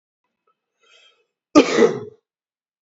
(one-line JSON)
{"cough_length": "2.8 s", "cough_amplitude": 27876, "cough_signal_mean_std_ratio": 0.27, "survey_phase": "beta (2021-08-13 to 2022-03-07)", "age": "18-44", "gender": "Male", "wearing_mask": "No", "symptom_runny_or_blocked_nose": true, "symptom_fatigue": true, "symptom_loss_of_taste": true, "symptom_onset": "4 days", "smoker_status": "Never smoked", "respiratory_condition_asthma": false, "respiratory_condition_other": false, "recruitment_source": "Test and Trace", "submission_delay": "2 days", "covid_test_result": "Positive", "covid_test_method": "RT-qPCR", "covid_ct_value": 18.1, "covid_ct_gene": "ORF1ab gene", "covid_ct_mean": 18.9, "covid_viral_load": "640000 copies/ml", "covid_viral_load_category": "Low viral load (10K-1M copies/ml)"}